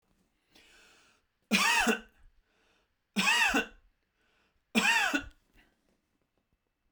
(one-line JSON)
{"three_cough_length": "6.9 s", "three_cough_amplitude": 10424, "three_cough_signal_mean_std_ratio": 0.38, "survey_phase": "beta (2021-08-13 to 2022-03-07)", "age": "45-64", "gender": "Male", "wearing_mask": "No", "symptom_none": true, "smoker_status": "Never smoked", "respiratory_condition_asthma": true, "respiratory_condition_other": false, "recruitment_source": "Test and Trace", "submission_delay": "0 days", "covid_test_result": "Negative", "covid_test_method": "LFT"}